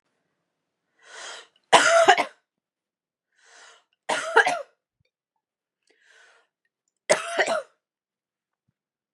{"three_cough_length": "9.1 s", "three_cough_amplitude": 31679, "three_cough_signal_mean_std_ratio": 0.28, "survey_phase": "beta (2021-08-13 to 2022-03-07)", "age": "18-44", "gender": "Female", "wearing_mask": "No", "symptom_none": true, "smoker_status": "Never smoked", "respiratory_condition_asthma": false, "respiratory_condition_other": false, "recruitment_source": "REACT", "submission_delay": "1 day", "covid_test_result": "Negative", "covid_test_method": "RT-qPCR"}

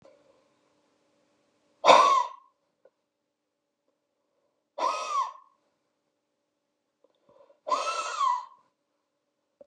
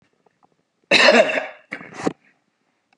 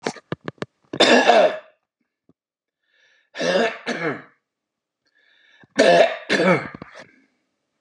{"exhalation_length": "9.7 s", "exhalation_amplitude": 22604, "exhalation_signal_mean_std_ratio": 0.28, "cough_length": "3.0 s", "cough_amplitude": 29750, "cough_signal_mean_std_ratio": 0.35, "three_cough_length": "7.8 s", "three_cough_amplitude": 29763, "three_cough_signal_mean_std_ratio": 0.4, "survey_phase": "beta (2021-08-13 to 2022-03-07)", "age": "45-64", "gender": "Male", "wearing_mask": "No", "symptom_none": true, "smoker_status": "Never smoked", "respiratory_condition_asthma": false, "respiratory_condition_other": false, "recruitment_source": "REACT", "submission_delay": "4 days", "covid_test_result": "Negative", "covid_test_method": "RT-qPCR", "influenza_a_test_result": "Unknown/Void", "influenza_b_test_result": "Unknown/Void"}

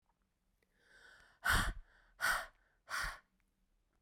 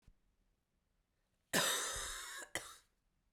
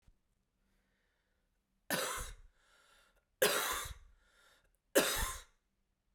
{"exhalation_length": "4.0 s", "exhalation_amplitude": 3086, "exhalation_signal_mean_std_ratio": 0.36, "cough_length": "3.3 s", "cough_amplitude": 3292, "cough_signal_mean_std_ratio": 0.41, "three_cough_length": "6.1 s", "three_cough_amplitude": 6725, "three_cough_signal_mean_std_ratio": 0.34, "survey_phase": "beta (2021-08-13 to 2022-03-07)", "age": "45-64", "gender": "Female", "wearing_mask": "No", "symptom_cough_any": true, "symptom_runny_or_blocked_nose": true, "symptom_shortness_of_breath": true, "symptom_fatigue": true, "symptom_fever_high_temperature": true, "symptom_headache": true, "symptom_onset": "5 days", "smoker_status": "Ex-smoker", "respiratory_condition_asthma": false, "respiratory_condition_other": false, "recruitment_source": "Test and Trace", "submission_delay": "3 days", "covid_test_method": "RT-qPCR"}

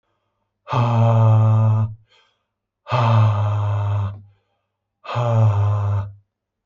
{"exhalation_length": "6.7 s", "exhalation_amplitude": 16653, "exhalation_signal_mean_std_ratio": 0.74, "survey_phase": "beta (2021-08-13 to 2022-03-07)", "age": "45-64", "gender": "Male", "wearing_mask": "No", "symptom_none": true, "smoker_status": "Ex-smoker", "respiratory_condition_asthma": false, "respiratory_condition_other": false, "recruitment_source": "REACT", "submission_delay": "2 days", "covid_test_result": "Negative", "covid_test_method": "RT-qPCR"}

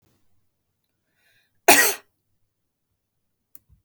{"cough_length": "3.8 s", "cough_amplitude": 32768, "cough_signal_mean_std_ratio": 0.19, "survey_phase": "beta (2021-08-13 to 2022-03-07)", "age": "18-44", "gender": "Female", "wearing_mask": "No", "symptom_none": true, "smoker_status": "Current smoker (1 to 10 cigarettes per day)", "respiratory_condition_asthma": false, "respiratory_condition_other": false, "recruitment_source": "REACT", "submission_delay": "3 days", "covid_test_result": "Negative", "covid_test_method": "RT-qPCR", "influenza_a_test_result": "Negative", "influenza_b_test_result": "Negative"}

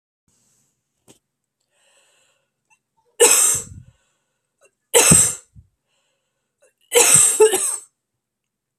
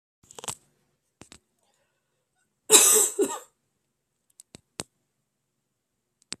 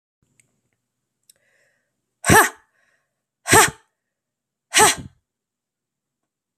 {"three_cough_length": "8.8 s", "three_cough_amplitude": 32768, "three_cough_signal_mean_std_ratio": 0.33, "cough_length": "6.4 s", "cough_amplitude": 32768, "cough_signal_mean_std_ratio": 0.23, "exhalation_length": "6.6 s", "exhalation_amplitude": 32767, "exhalation_signal_mean_std_ratio": 0.24, "survey_phase": "beta (2021-08-13 to 2022-03-07)", "age": "18-44", "gender": "Female", "wearing_mask": "No", "symptom_cough_any": true, "symptom_sore_throat": true, "symptom_loss_of_taste": true, "smoker_status": "Ex-smoker", "respiratory_condition_asthma": false, "respiratory_condition_other": false, "recruitment_source": "Test and Trace", "submission_delay": "2 days", "covid_test_result": "Positive", "covid_test_method": "RT-qPCR", "covid_ct_value": 18.3, "covid_ct_gene": "ORF1ab gene", "covid_ct_mean": 18.3, "covid_viral_load": "960000 copies/ml", "covid_viral_load_category": "Low viral load (10K-1M copies/ml)"}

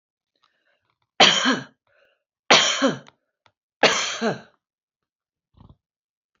{"three_cough_length": "6.4 s", "three_cough_amplitude": 29628, "three_cough_signal_mean_std_ratio": 0.32, "survey_phase": "beta (2021-08-13 to 2022-03-07)", "age": "65+", "gender": "Female", "wearing_mask": "No", "symptom_none": true, "smoker_status": "Never smoked", "respiratory_condition_asthma": false, "respiratory_condition_other": true, "recruitment_source": "REACT", "submission_delay": "2 days", "covid_test_result": "Negative", "covid_test_method": "RT-qPCR", "influenza_a_test_result": "Unknown/Void", "influenza_b_test_result": "Unknown/Void"}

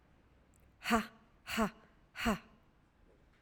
{"exhalation_length": "3.4 s", "exhalation_amplitude": 4274, "exhalation_signal_mean_std_ratio": 0.35, "survey_phase": "alpha (2021-03-01 to 2021-08-12)", "age": "45-64", "gender": "Female", "wearing_mask": "No", "symptom_cough_any": true, "symptom_fatigue": true, "symptom_headache": true, "symptom_change_to_sense_of_smell_or_taste": true, "smoker_status": "Never smoked", "respiratory_condition_asthma": false, "respiratory_condition_other": false, "recruitment_source": "Test and Trace", "submission_delay": "2 days", "covid_test_result": "Positive", "covid_test_method": "RT-qPCR", "covid_ct_value": 28.5, "covid_ct_gene": "ORF1ab gene", "covid_ct_mean": 28.8, "covid_viral_load": "360 copies/ml", "covid_viral_load_category": "Minimal viral load (< 10K copies/ml)"}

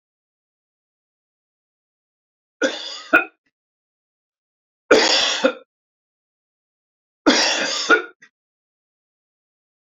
{"three_cough_length": "10.0 s", "three_cough_amplitude": 28309, "three_cough_signal_mean_std_ratio": 0.3, "survey_phase": "beta (2021-08-13 to 2022-03-07)", "age": "65+", "gender": "Male", "wearing_mask": "No", "symptom_cough_any": true, "symptom_runny_or_blocked_nose": true, "smoker_status": "Ex-smoker", "respiratory_condition_asthma": false, "respiratory_condition_other": false, "recruitment_source": "REACT", "submission_delay": "0 days", "covid_test_result": "Negative", "covid_test_method": "RT-qPCR"}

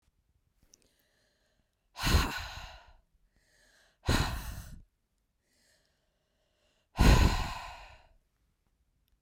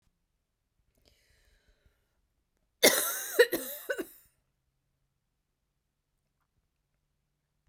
{"exhalation_length": "9.2 s", "exhalation_amplitude": 10684, "exhalation_signal_mean_std_ratio": 0.29, "cough_length": "7.7 s", "cough_amplitude": 18114, "cough_signal_mean_std_ratio": 0.21, "survey_phase": "beta (2021-08-13 to 2022-03-07)", "age": "18-44", "gender": "Female", "wearing_mask": "No", "symptom_headache": true, "smoker_status": "Never smoked", "respiratory_condition_asthma": false, "respiratory_condition_other": false, "recruitment_source": "REACT", "submission_delay": "2 days", "covid_test_result": "Negative", "covid_test_method": "RT-qPCR", "covid_ct_value": 38.0, "covid_ct_gene": "N gene", "influenza_a_test_result": "Negative", "influenza_b_test_result": "Negative"}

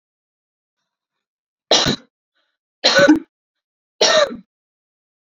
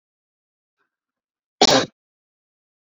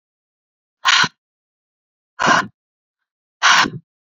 {"three_cough_length": "5.4 s", "three_cough_amplitude": 32768, "three_cough_signal_mean_std_ratio": 0.32, "cough_length": "2.8 s", "cough_amplitude": 31271, "cough_signal_mean_std_ratio": 0.21, "exhalation_length": "4.2 s", "exhalation_amplitude": 32768, "exhalation_signal_mean_std_ratio": 0.33, "survey_phase": "beta (2021-08-13 to 2022-03-07)", "age": "18-44", "gender": "Female", "wearing_mask": "No", "symptom_fatigue": true, "symptom_other": true, "symptom_onset": "12 days", "smoker_status": "Ex-smoker", "respiratory_condition_asthma": false, "respiratory_condition_other": false, "recruitment_source": "REACT", "submission_delay": "2 days", "covid_test_result": "Negative", "covid_test_method": "RT-qPCR"}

